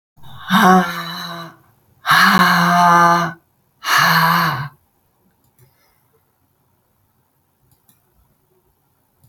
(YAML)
exhalation_length: 9.3 s
exhalation_amplitude: 30018
exhalation_signal_mean_std_ratio: 0.46
survey_phase: alpha (2021-03-01 to 2021-08-12)
age: 45-64
gender: Female
wearing_mask: 'No'
symptom_none: true
smoker_status: Ex-smoker
respiratory_condition_asthma: false
respiratory_condition_other: false
recruitment_source: REACT
submission_delay: 1 day
covid_test_result: Negative
covid_test_method: RT-qPCR